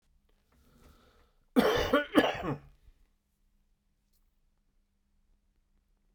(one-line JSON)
{"cough_length": "6.1 s", "cough_amplitude": 14401, "cough_signal_mean_std_ratio": 0.28, "survey_phase": "beta (2021-08-13 to 2022-03-07)", "age": "65+", "gender": "Male", "wearing_mask": "No", "symptom_none": true, "symptom_onset": "5 days", "smoker_status": "Ex-smoker", "respiratory_condition_asthma": true, "respiratory_condition_other": false, "recruitment_source": "Test and Trace", "submission_delay": "2 days", "covid_test_result": "Positive", "covid_test_method": "RT-qPCR", "covid_ct_value": 21.0, "covid_ct_gene": "ORF1ab gene", "covid_ct_mean": 21.5, "covid_viral_load": "86000 copies/ml", "covid_viral_load_category": "Low viral load (10K-1M copies/ml)"}